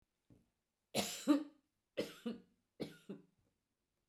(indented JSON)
{
  "three_cough_length": "4.1 s",
  "three_cough_amplitude": 2946,
  "three_cough_signal_mean_std_ratio": 0.3,
  "survey_phase": "beta (2021-08-13 to 2022-03-07)",
  "age": "65+",
  "gender": "Female",
  "wearing_mask": "No",
  "symptom_none": true,
  "smoker_status": "Never smoked",
  "respiratory_condition_asthma": false,
  "respiratory_condition_other": false,
  "recruitment_source": "REACT",
  "submission_delay": "1 day",
  "covid_test_result": "Negative",
  "covid_test_method": "RT-qPCR"
}